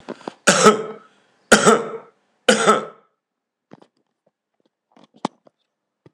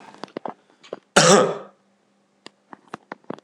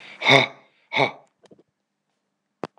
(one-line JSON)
{"three_cough_length": "6.1 s", "three_cough_amplitude": 26028, "three_cough_signal_mean_std_ratio": 0.31, "cough_length": "3.4 s", "cough_amplitude": 26028, "cough_signal_mean_std_ratio": 0.29, "exhalation_length": "2.8 s", "exhalation_amplitude": 26028, "exhalation_signal_mean_std_ratio": 0.29, "survey_phase": "beta (2021-08-13 to 2022-03-07)", "age": "65+", "gender": "Male", "wearing_mask": "No", "symptom_none": true, "smoker_status": "Ex-smoker", "respiratory_condition_asthma": false, "respiratory_condition_other": false, "recruitment_source": "REACT", "submission_delay": "2 days", "covid_test_result": "Negative", "covid_test_method": "RT-qPCR", "influenza_a_test_result": "Negative", "influenza_b_test_result": "Negative"}